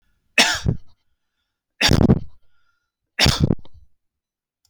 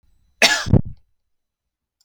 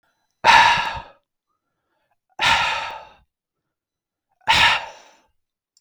{
  "three_cough_length": "4.7 s",
  "three_cough_amplitude": 32768,
  "three_cough_signal_mean_std_ratio": 0.37,
  "cough_length": "2.0 s",
  "cough_amplitude": 32768,
  "cough_signal_mean_std_ratio": 0.31,
  "exhalation_length": "5.8 s",
  "exhalation_amplitude": 32768,
  "exhalation_signal_mean_std_ratio": 0.37,
  "survey_phase": "beta (2021-08-13 to 2022-03-07)",
  "age": "45-64",
  "gender": "Male",
  "wearing_mask": "No",
  "symptom_none": true,
  "smoker_status": "Never smoked",
  "respiratory_condition_asthma": false,
  "respiratory_condition_other": false,
  "recruitment_source": "REACT",
  "submission_delay": "1 day",
  "covid_test_result": "Negative",
  "covid_test_method": "RT-qPCR",
  "influenza_a_test_result": "Negative",
  "influenza_b_test_result": "Negative"
}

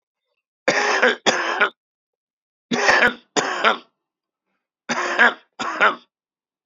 {
  "three_cough_length": "6.7 s",
  "three_cough_amplitude": 30940,
  "three_cough_signal_mean_std_ratio": 0.45,
  "survey_phase": "beta (2021-08-13 to 2022-03-07)",
  "age": "45-64",
  "gender": "Male",
  "wearing_mask": "No",
  "symptom_shortness_of_breath": true,
  "symptom_headache": true,
  "smoker_status": "Current smoker (11 or more cigarettes per day)",
  "respiratory_condition_asthma": false,
  "respiratory_condition_other": true,
  "recruitment_source": "REACT",
  "submission_delay": "2 days",
  "covid_test_result": "Negative",
  "covid_test_method": "RT-qPCR",
  "influenza_a_test_result": "Negative",
  "influenza_b_test_result": "Negative"
}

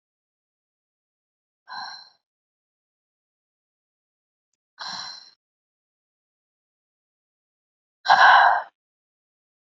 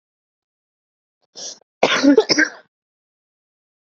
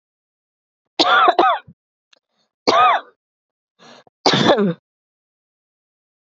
{
  "exhalation_length": "9.7 s",
  "exhalation_amplitude": 26963,
  "exhalation_signal_mean_std_ratio": 0.2,
  "cough_length": "3.8 s",
  "cough_amplitude": 30335,
  "cough_signal_mean_std_ratio": 0.3,
  "three_cough_length": "6.3 s",
  "three_cough_amplitude": 32660,
  "three_cough_signal_mean_std_ratio": 0.38,
  "survey_phase": "beta (2021-08-13 to 2022-03-07)",
  "age": "18-44",
  "gender": "Female",
  "wearing_mask": "Yes",
  "symptom_runny_or_blocked_nose": true,
  "symptom_shortness_of_breath": true,
  "symptom_diarrhoea": true,
  "symptom_fatigue": true,
  "symptom_change_to_sense_of_smell_or_taste": true,
  "smoker_status": "Current smoker (1 to 10 cigarettes per day)",
  "respiratory_condition_asthma": true,
  "respiratory_condition_other": false,
  "recruitment_source": "Test and Trace",
  "submission_delay": "1 day",
  "covid_test_result": "Positive",
  "covid_test_method": "ePCR"
}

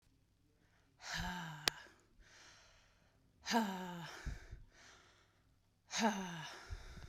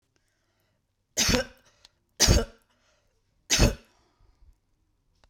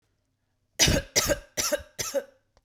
{
  "exhalation_length": "7.1 s",
  "exhalation_amplitude": 14570,
  "exhalation_signal_mean_std_ratio": 0.44,
  "three_cough_length": "5.3 s",
  "three_cough_amplitude": 26441,
  "three_cough_signal_mean_std_ratio": 0.29,
  "cough_length": "2.6 s",
  "cough_amplitude": 15970,
  "cough_signal_mean_std_ratio": 0.44,
  "survey_phase": "beta (2021-08-13 to 2022-03-07)",
  "age": "18-44",
  "gender": "Female",
  "wearing_mask": "No",
  "symptom_shortness_of_breath": true,
  "symptom_sore_throat": true,
  "symptom_fatigue": true,
  "symptom_headache": true,
  "symptom_other": true,
  "smoker_status": "Never smoked",
  "respiratory_condition_asthma": false,
  "respiratory_condition_other": false,
  "recruitment_source": "Test and Trace",
  "submission_delay": "2 days",
  "covid_test_result": "Positive",
  "covid_test_method": "RT-qPCR",
  "covid_ct_value": 21.6,
  "covid_ct_gene": "ORF1ab gene",
  "covid_ct_mean": 22.2,
  "covid_viral_load": "53000 copies/ml",
  "covid_viral_load_category": "Low viral load (10K-1M copies/ml)"
}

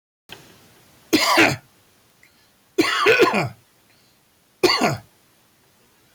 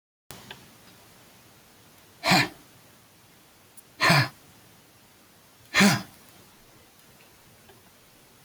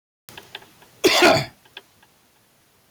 {
  "three_cough_length": "6.1 s",
  "three_cough_amplitude": 18834,
  "three_cough_signal_mean_std_ratio": 0.4,
  "exhalation_length": "8.4 s",
  "exhalation_amplitude": 15553,
  "exhalation_signal_mean_std_ratio": 0.28,
  "cough_length": "2.9 s",
  "cough_amplitude": 16414,
  "cough_signal_mean_std_ratio": 0.32,
  "survey_phase": "beta (2021-08-13 to 2022-03-07)",
  "age": "18-44",
  "gender": "Male",
  "wearing_mask": "No",
  "symptom_none": true,
  "smoker_status": "Current smoker (11 or more cigarettes per day)",
  "respiratory_condition_asthma": false,
  "respiratory_condition_other": false,
  "recruitment_source": "REACT",
  "submission_delay": "1 day",
  "covid_test_result": "Negative",
  "covid_test_method": "RT-qPCR",
  "influenza_a_test_result": "Negative",
  "influenza_b_test_result": "Negative"
}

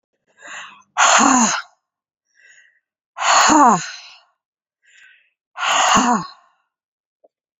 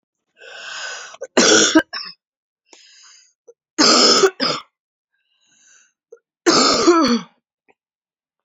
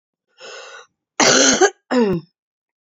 {
  "exhalation_length": "7.6 s",
  "exhalation_amplitude": 32767,
  "exhalation_signal_mean_std_ratio": 0.42,
  "three_cough_length": "8.4 s",
  "three_cough_amplitude": 32767,
  "three_cough_signal_mean_std_ratio": 0.41,
  "cough_length": "2.9 s",
  "cough_amplitude": 32768,
  "cough_signal_mean_std_ratio": 0.45,
  "survey_phase": "beta (2021-08-13 to 2022-03-07)",
  "age": "45-64",
  "gender": "Female",
  "wearing_mask": "No",
  "symptom_cough_any": true,
  "symptom_runny_or_blocked_nose": true,
  "symptom_sore_throat": true,
  "symptom_fatigue": true,
  "smoker_status": "Ex-smoker",
  "respiratory_condition_asthma": false,
  "respiratory_condition_other": false,
  "recruitment_source": "Test and Trace",
  "submission_delay": "2 days",
  "covid_test_result": "Positive",
  "covid_test_method": "RT-qPCR",
  "covid_ct_value": 25.6,
  "covid_ct_gene": "ORF1ab gene",
  "covid_ct_mean": 26.1,
  "covid_viral_load": "2700 copies/ml",
  "covid_viral_load_category": "Minimal viral load (< 10K copies/ml)"
}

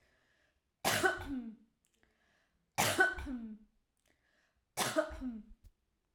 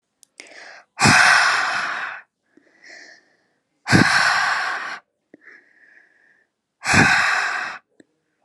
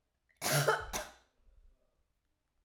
{
  "three_cough_length": "6.1 s",
  "three_cough_amplitude": 5848,
  "three_cough_signal_mean_std_ratio": 0.41,
  "exhalation_length": "8.4 s",
  "exhalation_amplitude": 29522,
  "exhalation_signal_mean_std_ratio": 0.48,
  "cough_length": "2.6 s",
  "cough_amplitude": 5057,
  "cough_signal_mean_std_ratio": 0.36,
  "survey_phase": "alpha (2021-03-01 to 2021-08-12)",
  "age": "18-44",
  "gender": "Female",
  "wearing_mask": "No",
  "symptom_none": true,
  "smoker_status": "Never smoked",
  "respiratory_condition_asthma": false,
  "respiratory_condition_other": false,
  "recruitment_source": "REACT",
  "submission_delay": "2 days",
  "covid_test_result": "Negative",
  "covid_test_method": "RT-qPCR"
}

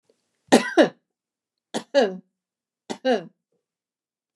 {
  "three_cough_length": "4.4 s",
  "three_cough_amplitude": 29204,
  "three_cough_signal_mean_std_ratio": 0.28,
  "survey_phase": "beta (2021-08-13 to 2022-03-07)",
  "age": "65+",
  "gender": "Female",
  "wearing_mask": "No",
  "symptom_none": true,
  "smoker_status": "Never smoked",
  "respiratory_condition_asthma": false,
  "respiratory_condition_other": false,
  "recruitment_source": "REACT",
  "submission_delay": "1 day",
  "covid_test_result": "Negative",
  "covid_test_method": "RT-qPCR",
  "influenza_a_test_result": "Negative",
  "influenza_b_test_result": "Negative"
}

